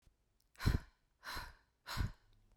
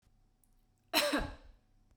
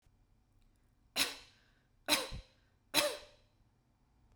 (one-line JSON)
{"exhalation_length": "2.6 s", "exhalation_amplitude": 3185, "exhalation_signal_mean_std_ratio": 0.35, "cough_length": "2.0 s", "cough_amplitude": 5896, "cough_signal_mean_std_ratio": 0.37, "three_cough_length": "4.4 s", "three_cough_amplitude": 7099, "three_cough_signal_mean_std_ratio": 0.3, "survey_phase": "beta (2021-08-13 to 2022-03-07)", "age": "18-44", "gender": "Female", "wearing_mask": "No", "symptom_none": true, "smoker_status": "Never smoked", "respiratory_condition_asthma": false, "respiratory_condition_other": false, "recruitment_source": "REACT", "submission_delay": "1 day", "covid_test_result": "Negative", "covid_test_method": "RT-qPCR"}